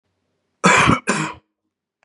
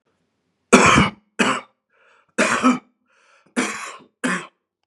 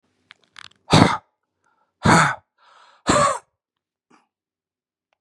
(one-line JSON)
{"cough_length": "2.0 s", "cough_amplitude": 30416, "cough_signal_mean_std_ratio": 0.41, "three_cough_length": "4.9 s", "three_cough_amplitude": 32768, "three_cough_signal_mean_std_ratio": 0.4, "exhalation_length": "5.2 s", "exhalation_amplitude": 32768, "exhalation_signal_mean_std_ratio": 0.31, "survey_phase": "beta (2021-08-13 to 2022-03-07)", "age": "45-64", "gender": "Male", "wearing_mask": "No", "symptom_cough_any": true, "symptom_runny_or_blocked_nose": true, "symptom_shortness_of_breath": true, "symptom_sore_throat": true, "symptom_headache": true, "symptom_onset": "2 days", "smoker_status": "Never smoked", "respiratory_condition_asthma": false, "respiratory_condition_other": false, "recruitment_source": "Test and Trace", "submission_delay": "1 day", "covid_test_result": "Positive", "covid_test_method": "ePCR"}